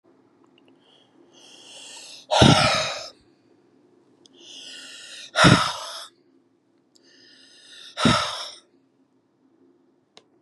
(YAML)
exhalation_length: 10.4 s
exhalation_amplitude: 31691
exhalation_signal_mean_std_ratio: 0.31
survey_phase: beta (2021-08-13 to 2022-03-07)
age: 65+
gender: Male
wearing_mask: 'No'
symptom_runny_or_blocked_nose: true
symptom_onset: 6 days
smoker_status: Never smoked
respiratory_condition_asthma: true
respiratory_condition_other: false
recruitment_source: REACT
submission_delay: 1 day
covid_test_result: Negative
covid_test_method: RT-qPCR
influenza_a_test_result: Negative
influenza_b_test_result: Negative